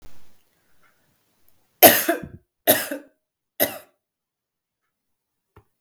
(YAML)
three_cough_length: 5.8 s
three_cough_amplitude: 32768
three_cough_signal_mean_std_ratio: 0.23
survey_phase: beta (2021-08-13 to 2022-03-07)
age: 45-64
gender: Female
wearing_mask: 'No'
symptom_cough_any: true
symptom_fatigue: true
symptom_change_to_sense_of_smell_or_taste: true
symptom_loss_of_taste: true
symptom_other: true
symptom_onset: 3 days
smoker_status: Never smoked
respiratory_condition_asthma: false
respiratory_condition_other: false
recruitment_source: Test and Trace
submission_delay: 1 day
covid_test_result: Positive
covid_test_method: RT-qPCR
covid_ct_value: 22.3
covid_ct_gene: ORF1ab gene
covid_ct_mean: 23.0
covid_viral_load: 29000 copies/ml
covid_viral_load_category: Low viral load (10K-1M copies/ml)